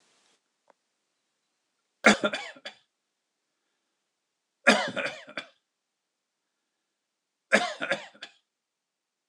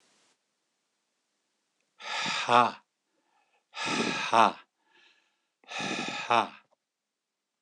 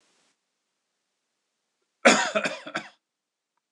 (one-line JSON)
{"three_cough_length": "9.3 s", "three_cough_amplitude": 20399, "three_cough_signal_mean_std_ratio": 0.23, "exhalation_length": "7.6 s", "exhalation_amplitude": 16537, "exhalation_signal_mean_std_ratio": 0.33, "cough_length": "3.7 s", "cough_amplitude": 24791, "cough_signal_mean_std_ratio": 0.24, "survey_phase": "beta (2021-08-13 to 2022-03-07)", "age": "45-64", "gender": "Male", "wearing_mask": "No", "symptom_none": true, "smoker_status": "Never smoked", "respiratory_condition_asthma": false, "respiratory_condition_other": false, "recruitment_source": "REACT", "submission_delay": "3 days", "covid_test_result": "Negative", "covid_test_method": "RT-qPCR", "influenza_a_test_result": "Negative", "influenza_b_test_result": "Negative"}